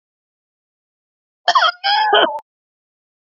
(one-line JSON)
{"cough_length": "3.3 s", "cough_amplitude": 31738, "cough_signal_mean_std_ratio": 0.39, "survey_phase": "beta (2021-08-13 to 2022-03-07)", "age": "65+", "gender": "Female", "wearing_mask": "Yes", "symptom_cough_any": true, "symptom_runny_or_blocked_nose": true, "symptom_fatigue": true, "symptom_headache": true, "symptom_onset": "4 days", "smoker_status": "Ex-smoker", "respiratory_condition_asthma": false, "respiratory_condition_other": true, "recruitment_source": "Test and Trace", "submission_delay": "2 days", "covid_test_result": "Positive", "covid_test_method": "RT-qPCR", "covid_ct_value": 16.4, "covid_ct_gene": "ORF1ab gene", "covid_ct_mean": 16.7, "covid_viral_load": "3400000 copies/ml", "covid_viral_load_category": "High viral load (>1M copies/ml)"}